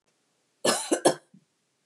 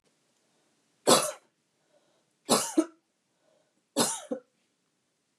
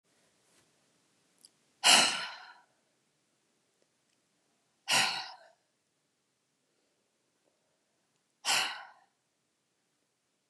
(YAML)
cough_length: 1.9 s
cough_amplitude: 16167
cough_signal_mean_std_ratio: 0.33
three_cough_length: 5.4 s
three_cough_amplitude: 18099
three_cough_signal_mean_std_ratio: 0.27
exhalation_length: 10.5 s
exhalation_amplitude: 12999
exhalation_signal_mean_std_ratio: 0.23
survey_phase: beta (2021-08-13 to 2022-03-07)
age: 45-64
gender: Female
wearing_mask: 'No'
symptom_runny_or_blocked_nose: true
symptom_sore_throat: true
symptom_fatigue: true
symptom_fever_high_temperature: true
symptom_headache: true
symptom_other: true
smoker_status: Never smoked
respiratory_condition_asthma: false
respiratory_condition_other: false
recruitment_source: Test and Trace
submission_delay: 2 days
covid_test_result: Positive
covid_test_method: RT-qPCR
covid_ct_value: 31.9
covid_ct_gene: N gene
covid_ct_mean: 31.9
covid_viral_load: 35 copies/ml
covid_viral_load_category: Minimal viral load (< 10K copies/ml)